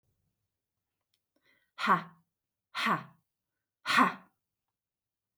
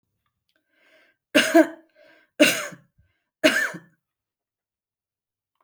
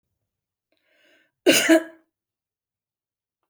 {"exhalation_length": "5.4 s", "exhalation_amplitude": 8820, "exhalation_signal_mean_std_ratio": 0.28, "three_cough_length": "5.6 s", "three_cough_amplitude": 26676, "three_cough_signal_mean_std_ratio": 0.27, "cough_length": "3.5 s", "cough_amplitude": 24003, "cough_signal_mean_std_ratio": 0.24, "survey_phase": "beta (2021-08-13 to 2022-03-07)", "age": "45-64", "gender": "Female", "wearing_mask": "No", "symptom_none": true, "smoker_status": "Never smoked", "respiratory_condition_asthma": false, "respiratory_condition_other": false, "recruitment_source": "REACT", "submission_delay": "2 days", "covid_test_result": "Negative", "covid_test_method": "RT-qPCR"}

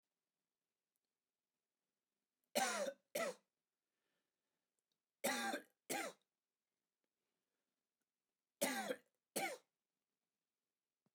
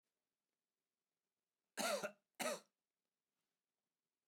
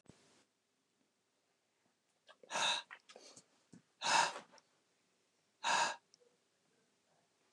{"three_cough_length": "11.1 s", "three_cough_amplitude": 1840, "three_cough_signal_mean_std_ratio": 0.3, "cough_length": "4.3 s", "cough_amplitude": 1265, "cough_signal_mean_std_ratio": 0.27, "exhalation_length": "7.5 s", "exhalation_amplitude": 3687, "exhalation_signal_mean_std_ratio": 0.29, "survey_phase": "alpha (2021-03-01 to 2021-08-12)", "age": "45-64", "gender": "Male", "wearing_mask": "No", "symptom_diarrhoea": true, "smoker_status": "Never smoked", "respiratory_condition_asthma": false, "respiratory_condition_other": false, "recruitment_source": "REACT", "submission_delay": "1 day", "covid_test_result": "Negative", "covid_test_method": "RT-qPCR"}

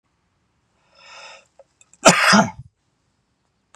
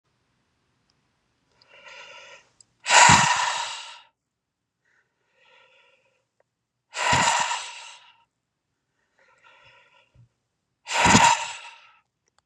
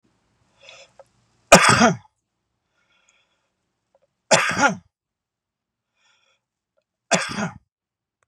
{"cough_length": "3.8 s", "cough_amplitude": 32768, "cough_signal_mean_std_ratio": 0.27, "exhalation_length": "12.5 s", "exhalation_amplitude": 29917, "exhalation_signal_mean_std_ratio": 0.31, "three_cough_length": "8.3 s", "three_cough_amplitude": 32768, "three_cough_signal_mean_std_ratio": 0.26, "survey_phase": "beta (2021-08-13 to 2022-03-07)", "age": "45-64", "gender": "Male", "wearing_mask": "No", "symptom_none": true, "smoker_status": "Ex-smoker", "respiratory_condition_asthma": false, "respiratory_condition_other": false, "recruitment_source": "REACT", "submission_delay": "1 day", "covid_test_result": "Negative", "covid_test_method": "RT-qPCR"}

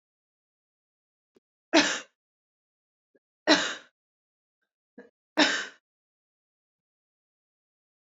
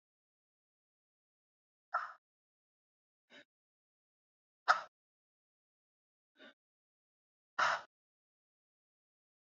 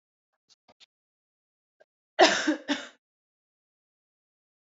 {"three_cough_length": "8.2 s", "three_cough_amplitude": 20593, "three_cough_signal_mean_std_ratio": 0.21, "exhalation_length": "9.5 s", "exhalation_amplitude": 7020, "exhalation_signal_mean_std_ratio": 0.16, "cough_length": "4.7 s", "cough_amplitude": 18110, "cough_signal_mean_std_ratio": 0.21, "survey_phase": "alpha (2021-03-01 to 2021-08-12)", "age": "18-44", "gender": "Female", "wearing_mask": "No", "symptom_cough_any": true, "symptom_headache": true, "smoker_status": "Never smoked", "respiratory_condition_asthma": false, "respiratory_condition_other": false, "recruitment_source": "Test and Trace", "submission_delay": "2 days", "covid_test_result": "Positive", "covid_test_method": "RT-qPCR"}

